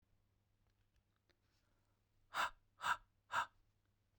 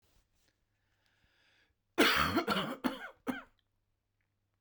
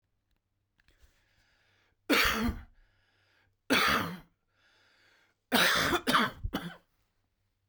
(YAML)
exhalation_length: 4.2 s
exhalation_amplitude: 1766
exhalation_signal_mean_std_ratio: 0.27
cough_length: 4.6 s
cough_amplitude: 6385
cough_signal_mean_std_ratio: 0.35
three_cough_length: 7.7 s
three_cough_amplitude: 12075
three_cough_signal_mean_std_ratio: 0.39
survey_phase: beta (2021-08-13 to 2022-03-07)
age: 45-64
gender: Male
wearing_mask: 'No'
symptom_runny_or_blocked_nose: true
symptom_shortness_of_breath: true
symptom_fatigue: true
symptom_headache: true
symptom_change_to_sense_of_smell_or_taste: true
symptom_onset: 3 days
smoker_status: Never smoked
respiratory_condition_asthma: false
respiratory_condition_other: false
recruitment_source: Test and Trace
submission_delay: 2 days
covid_test_result: Positive
covid_test_method: RT-qPCR